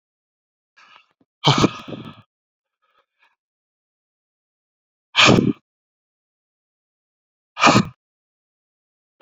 {"exhalation_length": "9.2 s", "exhalation_amplitude": 32768, "exhalation_signal_mean_std_ratio": 0.24, "survey_phase": "beta (2021-08-13 to 2022-03-07)", "age": "18-44", "gender": "Male", "wearing_mask": "No", "symptom_none": true, "smoker_status": "Ex-smoker", "respiratory_condition_asthma": false, "respiratory_condition_other": false, "recruitment_source": "REACT", "submission_delay": "2 days", "covid_test_result": "Negative", "covid_test_method": "RT-qPCR"}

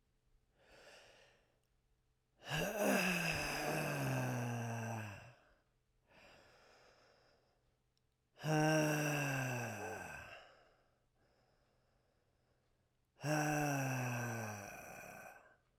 {"exhalation_length": "15.8 s", "exhalation_amplitude": 2680, "exhalation_signal_mean_std_ratio": 0.54, "survey_phase": "beta (2021-08-13 to 2022-03-07)", "age": "18-44", "gender": "Male", "wearing_mask": "No", "symptom_cough_any": true, "symptom_runny_or_blocked_nose": true, "symptom_shortness_of_breath": true, "symptom_sore_throat": true, "symptom_fatigue": true, "symptom_headache": true, "symptom_loss_of_taste": true, "symptom_other": true, "smoker_status": "Ex-smoker", "respiratory_condition_asthma": false, "respiratory_condition_other": false, "recruitment_source": "Test and Trace", "submission_delay": "1 day", "covid_test_result": "Positive", "covid_test_method": "RT-qPCR", "covid_ct_value": 20.3, "covid_ct_gene": "ORF1ab gene"}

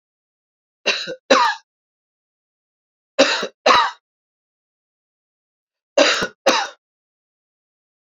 {"three_cough_length": "8.0 s", "three_cough_amplitude": 29457, "three_cough_signal_mean_std_ratio": 0.32, "survey_phase": "beta (2021-08-13 to 2022-03-07)", "age": "45-64", "gender": "Male", "wearing_mask": "No", "symptom_cough_any": true, "symptom_runny_or_blocked_nose": true, "symptom_sore_throat": true, "smoker_status": "Never smoked", "respiratory_condition_asthma": false, "respiratory_condition_other": false, "recruitment_source": "REACT", "submission_delay": "1 day", "covid_test_result": "Negative", "covid_test_method": "RT-qPCR"}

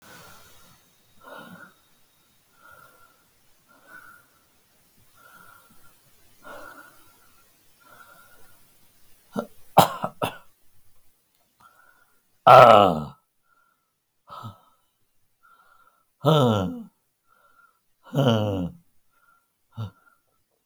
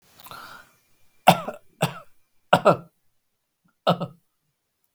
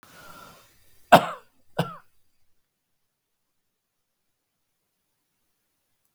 {"exhalation_length": "20.7 s", "exhalation_amplitude": 32768, "exhalation_signal_mean_std_ratio": 0.22, "three_cough_length": "4.9 s", "three_cough_amplitude": 32768, "three_cough_signal_mean_std_ratio": 0.25, "cough_length": "6.1 s", "cough_amplitude": 32768, "cough_signal_mean_std_ratio": 0.14, "survey_phase": "beta (2021-08-13 to 2022-03-07)", "age": "65+", "gender": "Male", "wearing_mask": "No", "symptom_cough_any": true, "smoker_status": "Never smoked", "respiratory_condition_asthma": true, "respiratory_condition_other": false, "recruitment_source": "REACT", "submission_delay": "3 days", "covid_test_result": "Negative", "covid_test_method": "RT-qPCR", "influenza_a_test_result": "Negative", "influenza_b_test_result": "Negative"}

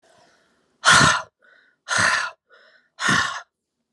{"exhalation_length": "3.9 s", "exhalation_amplitude": 27222, "exhalation_signal_mean_std_ratio": 0.41, "survey_phase": "alpha (2021-03-01 to 2021-08-12)", "age": "18-44", "gender": "Male", "wearing_mask": "No", "symptom_fatigue": true, "symptom_headache": true, "symptom_change_to_sense_of_smell_or_taste": true, "symptom_loss_of_taste": true, "symptom_onset": "5 days", "smoker_status": "Never smoked", "respiratory_condition_asthma": false, "respiratory_condition_other": false, "recruitment_source": "Test and Trace", "submission_delay": "1 day", "covid_test_result": "Positive", "covid_test_method": "RT-qPCR"}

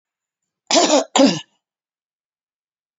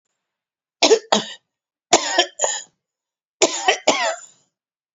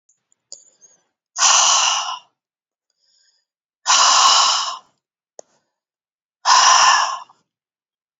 {"cough_length": "3.0 s", "cough_amplitude": 30019, "cough_signal_mean_std_ratio": 0.34, "three_cough_length": "4.9 s", "three_cough_amplitude": 32767, "three_cough_signal_mean_std_ratio": 0.37, "exhalation_length": "8.2 s", "exhalation_amplitude": 30840, "exhalation_signal_mean_std_ratio": 0.44, "survey_phase": "beta (2021-08-13 to 2022-03-07)", "age": "45-64", "gender": "Female", "wearing_mask": "No", "symptom_cough_any": true, "symptom_shortness_of_breath": true, "symptom_abdominal_pain": true, "symptom_diarrhoea": true, "symptom_fatigue": true, "symptom_headache": true, "symptom_change_to_sense_of_smell_or_taste": true, "symptom_onset": "12 days", "smoker_status": "Never smoked", "respiratory_condition_asthma": false, "respiratory_condition_other": false, "recruitment_source": "REACT", "submission_delay": "1 day", "covid_test_result": "Negative", "covid_test_method": "RT-qPCR", "influenza_a_test_result": "Negative", "influenza_b_test_result": "Negative"}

